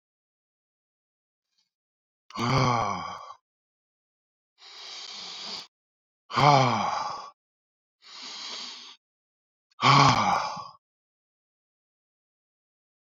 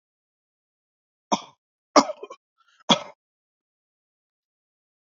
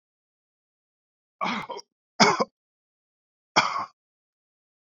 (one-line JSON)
{"exhalation_length": "13.1 s", "exhalation_amplitude": 21144, "exhalation_signal_mean_std_ratio": 0.34, "cough_length": "5.0 s", "cough_amplitude": 25756, "cough_signal_mean_std_ratio": 0.16, "three_cough_length": "4.9 s", "three_cough_amplitude": 21873, "three_cough_signal_mean_std_ratio": 0.26, "survey_phase": "beta (2021-08-13 to 2022-03-07)", "age": "18-44", "gender": "Male", "wearing_mask": "No", "symptom_none": true, "smoker_status": "Never smoked", "respiratory_condition_asthma": false, "respiratory_condition_other": false, "recruitment_source": "REACT", "submission_delay": "1 day", "covid_test_result": "Negative", "covid_test_method": "RT-qPCR", "influenza_a_test_result": "Negative", "influenza_b_test_result": "Negative"}